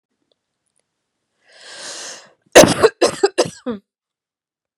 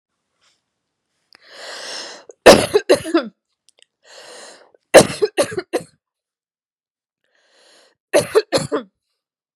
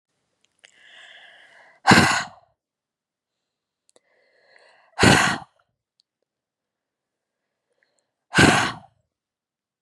{"cough_length": "4.8 s", "cough_amplitude": 32768, "cough_signal_mean_std_ratio": 0.27, "three_cough_length": "9.6 s", "three_cough_amplitude": 32768, "three_cough_signal_mean_std_ratio": 0.27, "exhalation_length": "9.8 s", "exhalation_amplitude": 32388, "exhalation_signal_mean_std_ratio": 0.26, "survey_phase": "beta (2021-08-13 to 2022-03-07)", "age": "18-44", "gender": "Female", "wearing_mask": "No", "symptom_headache": true, "symptom_onset": "12 days", "smoker_status": "Ex-smoker", "respiratory_condition_asthma": false, "respiratory_condition_other": false, "recruitment_source": "REACT", "submission_delay": "2 days", "covid_test_result": "Negative", "covid_test_method": "RT-qPCR", "influenza_a_test_result": "Negative", "influenza_b_test_result": "Negative"}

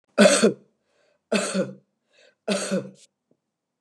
{"three_cough_length": "3.8 s", "three_cough_amplitude": 26546, "three_cough_signal_mean_std_ratio": 0.37, "survey_phase": "beta (2021-08-13 to 2022-03-07)", "age": "65+", "gender": "Female", "wearing_mask": "No", "symptom_runny_or_blocked_nose": true, "symptom_sore_throat": true, "symptom_onset": "2 days", "smoker_status": "Never smoked", "respiratory_condition_asthma": false, "respiratory_condition_other": false, "recruitment_source": "Test and Trace", "submission_delay": "1 day", "covid_test_result": "Positive", "covid_test_method": "RT-qPCR", "covid_ct_value": 24.1, "covid_ct_gene": "N gene"}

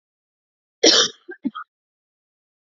{"cough_length": "2.7 s", "cough_amplitude": 27208, "cough_signal_mean_std_ratio": 0.26, "survey_phase": "beta (2021-08-13 to 2022-03-07)", "age": "45-64", "gender": "Female", "wearing_mask": "No", "symptom_cough_any": true, "symptom_runny_or_blocked_nose": true, "symptom_onset": "4 days", "smoker_status": "Ex-smoker", "respiratory_condition_asthma": false, "respiratory_condition_other": false, "recruitment_source": "Test and Trace", "submission_delay": "2 days", "covid_test_result": "Positive", "covid_test_method": "RT-qPCR", "covid_ct_value": 35.0, "covid_ct_gene": "ORF1ab gene"}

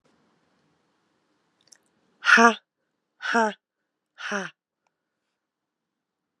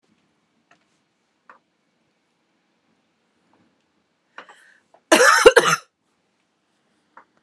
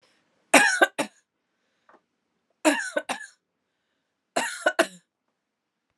{"exhalation_length": "6.4 s", "exhalation_amplitude": 29040, "exhalation_signal_mean_std_ratio": 0.22, "cough_length": "7.4 s", "cough_amplitude": 32768, "cough_signal_mean_std_ratio": 0.21, "three_cough_length": "6.0 s", "three_cough_amplitude": 26783, "three_cough_signal_mean_std_ratio": 0.29, "survey_phase": "alpha (2021-03-01 to 2021-08-12)", "age": "18-44", "gender": "Female", "wearing_mask": "No", "symptom_cough_any": true, "symptom_shortness_of_breath": true, "symptom_fatigue": true, "symptom_fever_high_temperature": true, "symptom_headache": true, "symptom_change_to_sense_of_smell_or_taste": true, "symptom_onset": "6 days", "smoker_status": "Never smoked", "respiratory_condition_asthma": false, "respiratory_condition_other": false, "recruitment_source": "Test and Trace", "submission_delay": "1 day", "covid_test_result": "Positive", "covid_test_method": "RT-qPCR"}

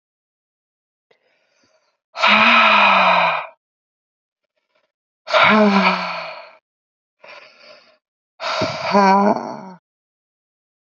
{"exhalation_length": "10.9 s", "exhalation_amplitude": 28201, "exhalation_signal_mean_std_ratio": 0.44, "survey_phase": "beta (2021-08-13 to 2022-03-07)", "age": "45-64", "gender": "Female", "wearing_mask": "No", "symptom_new_continuous_cough": true, "symptom_runny_or_blocked_nose": true, "symptom_shortness_of_breath": true, "symptom_sore_throat": true, "symptom_diarrhoea": true, "symptom_fatigue": true, "symptom_fever_high_temperature": true, "symptom_change_to_sense_of_smell_or_taste": true, "smoker_status": "Ex-smoker", "respiratory_condition_asthma": false, "respiratory_condition_other": false, "recruitment_source": "Test and Trace", "submission_delay": "2 days", "covid_test_result": "Positive", "covid_test_method": "LFT"}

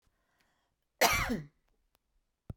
{"cough_length": "2.6 s", "cough_amplitude": 11357, "cough_signal_mean_std_ratio": 0.3, "survey_phase": "beta (2021-08-13 to 2022-03-07)", "age": "65+", "gender": "Female", "wearing_mask": "No", "symptom_none": true, "smoker_status": "Never smoked", "respiratory_condition_asthma": false, "respiratory_condition_other": false, "recruitment_source": "REACT", "submission_delay": "2 days", "covid_test_result": "Negative", "covid_test_method": "RT-qPCR"}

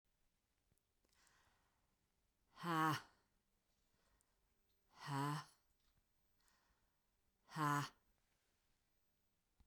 {"exhalation_length": "9.7 s", "exhalation_amplitude": 1272, "exhalation_signal_mean_std_ratio": 0.29, "survey_phase": "beta (2021-08-13 to 2022-03-07)", "age": "45-64", "gender": "Female", "wearing_mask": "No", "symptom_runny_or_blocked_nose": true, "symptom_fatigue": true, "symptom_headache": true, "symptom_change_to_sense_of_smell_or_taste": true, "symptom_loss_of_taste": true, "symptom_onset": "3 days", "smoker_status": "Ex-smoker", "respiratory_condition_asthma": false, "respiratory_condition_other": false, "recruitment_source": "Test and Trace", "submission_delay": "1 day", "covid_test_result": "Positive", "covid_test_method": "RT-qPCR", "covid_ct_value": 21.7, "covid_ct_gene": "ORF1ab gene", "covid_ct_mean": 22.1, "covid_viral_load": "56000 copies/ml", "covid_viral_load_category": "Low viral load (10K-1M copies/ml)"}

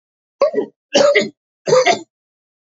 {"three_cough_length": "2.7 s", "three_cough_amplitude": 29927, "three_cough_signal_mean_std_ratio": 0.46, "survey_phase": "beta (2021-08-13 to 2022-03-07)", "age": "45-64", "gender": "Male", "wearing_mask": "No", "symptom_none": true, "symptom_onset": "10 days", "smoker_status": "Never smoked", "respiratory_condition_asthma": false, "respiratory_condition_other": false, "recruitment_source": "REACT", "submission_delay": "0 days", "covid_test_result": "Negative", "covid_test_method": "RT-qPCR", "influenza_a_test_result": "Negative", "influenza_b_test_result": "Negative"}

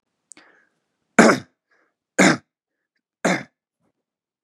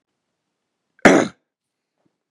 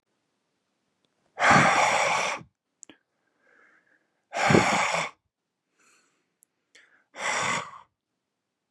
{"three_cough_length": "4.4 s", "three_cough_amplitude": 32764, "three_cough_signal_mean_std_ratio": 0.25, "cough_length": "2.3 s", "cough_amplitude": 32768, "cough_signal_mean_std_ratio": 0.22, "exhalation_length": "8.7 s", "exhalation_amplitude": 19387, "exhalation_signal_mean_std_ratio": 0.39, "survey_phase": "beta (2021-08-13 to 2022-03-07)", "age": "18-44", "gender": "Male", "wearing_mask": "No", "symptom_none": true, "smoker_status": "Ex-smoker", "respiratory_condition_asthma": false, "respiratory_condition_other": false, "recruitment_source": "Test and Trace", "submission_delay": "2 days", "covid_test_result": "Positive", "covid_test_method": "RT-qPCR", "covid_ct_value": 23.6, "covid_ct_gene": "ORF1ab gene", "covid_ct_mean": 23.9, "covid_viral_load": "14000 copies/ml", "covid_viral_load_category": "Low viral load (10K-1M copies/ml)"}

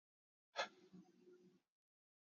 {"cough_length": "2.4 s", "cough_amplitude": 884, "cough_signal_mean_std_ratio": 0.24, "survey_phase": "beta (2021-08-13 to 2022-03-07)", "age": "18-44", "gender": "Male", "wearing_mask": "No", "symptom_cough_any": true, "symptom_runny_or_blocked_nose": true, "symptom_sore_throat": true, "symptom_fatigue": true, "symptom_fever_high_temperature": true, "symptom_headache": true, "smoker_status": "Ex-smoker", "respiratory_condition_asthma": false, "respiratory_condition_other": false, "recruitment_source": "Test and Trace", "submission_delay": "1 day", "covid_test_result": "Positive", "covid_test_method": "LFT"}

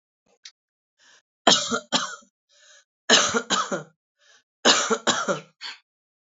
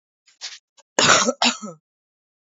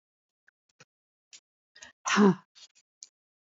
{"three_cough_length": "6.2 s", "three_cough_amplitude": 27989, "three_cough_signal_mean_std_ratio": 0.38, "cough_length": "2.6 s", "cough_amplitude": 28360, "cough_signal_mean_std_ratio": 0.35, "exhalation_length": "3.5 s", "exhalation_amplitude": 11078, "exhalation_signal_mean_std_ratio": 0.22, "survey_phase": "beta (2021-08-13 to 2022-03-07)", "age": "45-64", "gender": "Female", "wearing_mask": "No", "symptom_cough_any": true, "symptom_sore_throat": true, "symptom_fatigue": true, "symptom_onset": "8 days", "smoker_status": "Ex-smoker", "respiratory_condition_asthma": false, "respiratory_condition_other": false, "recruitment_source": "REACT", "submission_delay": "2 days", "covid_test_result": "Negative", "covid_test_method": "RT-qPCR", "influenza_a_test_result": "Unknown/Void", "influenza_b_test_result": "Unknown/Void"}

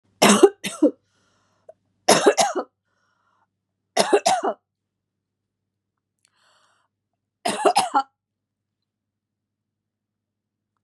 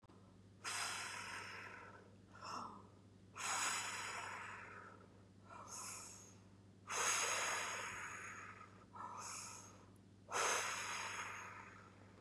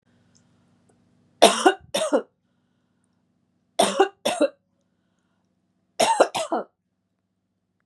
{"cough_length": "10.8 s", "cough_amplitude": 31597, "cough_signal_mean_std_ratio": 0.29, "exhalation_length": "12.2 s", "exhalation_amplitude": 1967, "exhalation_signal_mean_std_ratio": 0.7, "three_cough_length": "7.9 s", "three_cough_amplitude": 32739, "three_cough_signal_mean_std_ratio": 0.3, "survey_phase": "beta (2021-08-13 to 2022-03-07)", "age": "45-64", "gender": "Female", "wearing_mask": "No", "symptom_abdominal_pain": true, "symptom_fatigue": true, "symptom_headache": true, "smoker_status": "Never smoked", "respiratory_condition_asthma": false, "respiratory_condition_other": false, "recruitment_source": "Test and Trace", "submission_delay": "1 day", "covid_test_result": "Positive", "covid_test_method": "RT-qPCR", "covid_ct_value": 26.0, "covid_ct_gene": "N gene", "covid_ct_mean": 27.2, "covid_viral_load": "1200 copies/ml", "covid_viral_load_category": "Minimal viral load (< 10K copies/ml)"}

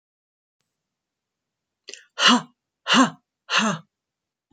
{"exhalation_length": "4.5 s", "exhalation_amplitude": 23812, "exhalation_signal_mean_std_ratio": 0.3, "survey_phase": "alpha (2021-03-01 to 2021-08-12)", "age": "18-44", "gender": "Female", "wearing_mask": "No", "symptom_none": true, "symptom_onset": "12 days", "smoker_status": "Never smoked", "respiratory_condition_asthma": false, "respiratory_condition_other": false, "recruitment_source": "REACT", "submission_delay": "1 day", "covid_test_result": "Negative", "covid_test_method": "RT-qPCR"}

